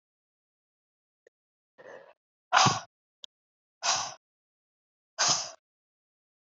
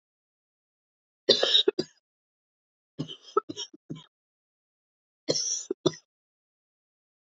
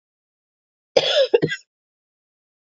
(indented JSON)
{
  "exhalation_length": "6.5 s",
  "exhalation_amplitude": 16060,
  "exhalation_signal_mean_std_ratio": 0.26,
  "three_cough_length": "7.3 s",
  "three_cough_amplitude": 16563,
  "three_cough_signal_mean_std_ratio": 0.26,
  "cough_length": "2.6 s",
  "cough_amplitude": 29395,
  "cough_signal_mean_std_ratio": 0.31,
  "survey_phase": "beta (2021-08-13 to 2022-03-07)",
  "age": "18-44",
  "gender": "Female",
  "wearing_mask": "No",
  "symptom_cough_any": true,
  "symptom_new_continuous_cough": true,
  "symptom_runny_or_blocked_nose": true,
  "symptom_fatigue": true,
  "symptom_change_to_sense_of_smell_or_taste": true,
  "symptom_loss_of_taste": true,
  "symptom_onset": "3 days",
  "smoker_status": "Never smoked",
  "respiratory_condition_asthma": false,
  "respiratory_condition_other": false,
  "recruitment_source": "Test and Trace",
  "submission_delay": "1 day",
  "covid_test_result": "Positive",
  "covid_test_method": "RT-qPCR"
}